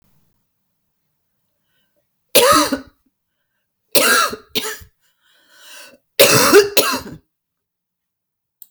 {"three_cough_length": "8.7 s", "three_cough_amplitude": 32768, "three_cough_signal_mean_std_ratio": 0.34, "survey_phase": "beta (2021-08-13 to 2022-03-07)", "age": "65+", "gender": "Female", "wearing_mask": "No", "symptom_cough_any": true, "symptom_fatigue": true, "symptom_fever_high_temperature": true, "symptom_headache": true, "symptom_change_to_sense_of_smell_or_taste": true, "symptom_loss_of_taste": true, "symptom_other": true, "symptom_onset": "9 days", "smoker_status": "Ex-smoker", "respiratory_condition_asthma": false, "respiratory_condition_other": false, "recruitment_source": "REACT", "submission_delay": "4 days", "covid_test_result": "Positive", "covid_test_method": "RT-qPCR", "covid_ct_value": 24.5, "covid_ct_gene": "E gene", "influenza_a_test_result": "Negative", "influenza_b_test_result": "Negative"}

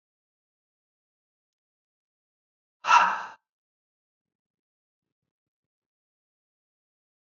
{"exhalation_length": "7.3 s", "exhalation_amplitude": 17515, "exhalation_signal_mean_std_ratio": 0.16, "survey_phase": "beta (2021-08-13 to 2022-03-07)", "age": "45-64", "gender": "Male", "wearing_mask": "No", "symptom_runny_or_blocked_nose": true, "symptom_onset": "13 days", "smoker_status": "Never smoked", "respiratory_condition_asthma": false, "respiratory_condition_other": false, "recruitment_source": "REACT", "submission_delay": "17 days", "covid_test_result": "Negative", "covid_test_method": "RT-qPCR", "influenza_a_test_result": "Negative", "influenza_b_test_result": "Negative"}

